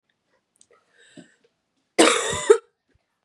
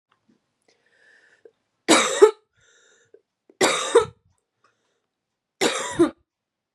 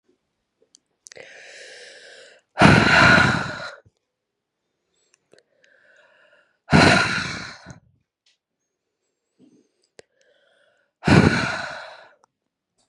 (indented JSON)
{
  "cough_length": "3.2 s",
  "cough_amplitude": 30247,
  "cough_signal_mean_std_ratio": 0.27,
  "three_cough_length": "6.7 s",
  "three_cough_amplitude": 31027,
  "three_cough_signal_mean_std_ratio": 0.29,
  "exhalation_length": "12.9 s",
  "exhalation_amplitude": 32768,
  "exhalation_signal_mean_std_ratio": 0.32,
  "survey_phase": "beta (2021-08-13 to 2022-03-07)",
  "age": "18-44",
  "gender": "Female",
  "wearing_mask": "No",
  "symptom_cough_any": true,
  "symptom_runny_or_blocked_nose": true,
  "symptom_shortness_of_breath": true,
  "symptom_fatigue": true,
  "symptom_fever_high_temperature": true,
  "symptom_headache": true,
  "symptom_other": true,
  "smoker_status": "Ex-smoker",
  "respiratory_condition_asthma": false,
  "respiratory_condition_other": false,
  "recruitment_source": "Test and Trace",
  "submission_delay": "2 days",
  "covid_test_result": "Positive",
  "covid_test_method": "RT-qPCR",
  "covid_ct_value": 21.1,
  "covid_ct_gene": "S gene",
  "covid_ct_mean": 21.9,
  "covid_viral_load": "67000 copies/ml",
  "covid_viral_load_category": "Low viral load (10K-1M copies/ml)"
}